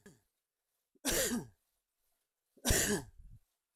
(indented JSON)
{
  "three_cough_length": "3.8 s",
  "three_cough_amplitude": 6188,
  "three_cough_signal_mean_std_ratio": 0.38,
  "survey_phase": "alpha (2021-03-01 to 2021-08-12)",
  "age": "18-44",
  "gender": "Male",
  "wearing_mask": "No",
  "symptom_none": true,
  "smoker_status": "Never smoked",
  "respiratory_condition_asthma": false,
  "respiratory_condition_other": false,
  "recruitment_source": "REACT",
  "submission_delay": "2 days",
  "covid_test_result": "Negative",
  "covid_test_method": "RT-qPCR"
}